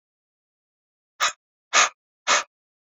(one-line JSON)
{"exhalation_length": "2.9 s", "exhalation_amplitude": 22640, "exhalation_signal_mean_std_ratio": 0.28, "survey_phase": "beta (2021-08-13 to 2022-03-07)", "age": "45-64", "gender": "Male", "wearing_mask": "No", "symptom_none": true, "smoker_status": "Ex-smoker", "respiratory_condition_asthma": false, "respiratory_condition_other": false, "recruitment_source": "REACT", "submission_delay": "8 days", "covid_test_result": "Negative", "covid_test_method": "RT-qPCR", "influenza_a_test_result": "Negative", "influenza_b_test_result": "Negative"}